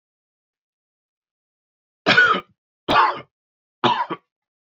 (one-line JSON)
{"three_cough_length": "4.7 s", "three_cough_amplitude": 25212, "three_cough_signal_mean_std_ratio": 0.34, "survey_phase": "beta (2021-08-13 to 2022-03-07)", "age": "45-64", "gender": "Male", "wearing_mask": "No", "symptom_none": true, "smoker_status": "Never smoked", "respiratory_condition_asthma": false, "respiratory_condition_other": false, "recruitment_source": "REACT", "submission_delay": "2 days", "covid_test_result": "Negative", "covid_test_method": "RT-qPCR"}